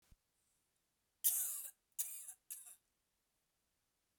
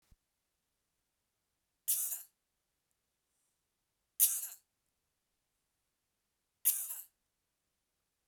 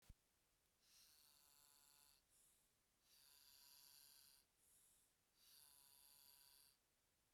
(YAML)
cough_length: 4.2 s
cough_amplitude: 4672
cough_signal_mean_std_ratio: 0.3
three_cough_length: 8.3 s
three_cough_amplitude: 9528
three_cough_signal_mean_std_ratio: 0.22
exhalation_length: 7.3 s
exhalation_amplitude: 97
exhalation_signal_mean_std_ratio: 0.77
survey_phase: beta (2021-08-13 to 2022-03-07)
age: 45-64
gender: Female
wearing_mask: 'No'
symptom_none: true
symptom_onset: 7 days
smoker_status: Ex-smoker
respiratory_condition_asthma: false
respiratory_condition_other: false
recruitment_source: REACT
submission_delay: 16 days
covid_test_result: Negative
covid_test_method: RT-qPCR